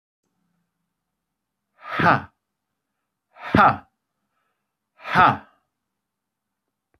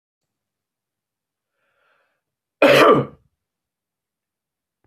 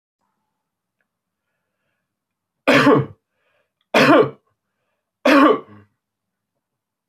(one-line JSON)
{"exhalation_length": "7.0 s", "exhalation_amplitude": 28411, "exhalation_signal_mean_std_ratio": 0.24, "cough_length": "4.9 s", "cough_amplitude": 25114, "cough_signal_mean_std_ratio": 0.24, "three_cough_length": "7.1 s", "three_cough_amplitude": 25015, "three_cough_signal_mean_std_ratio": 0.32, "survey_phase": "alpha (2021-03-01 to 2021-08-12)", "age": "18-44", "gender": "Male", "wearing_mask": "No", "symptom_none": true, "symptom_onset": "7 days", "smoker_status": "Never smoked", "respiratory_condition_asthma": false, "respiratory_condition_other": false, "recruitment_source": "REACT", "submission_delay": "2 days", "covid_test_result": "Negative", "covid_test_method": "RT-qPCR"}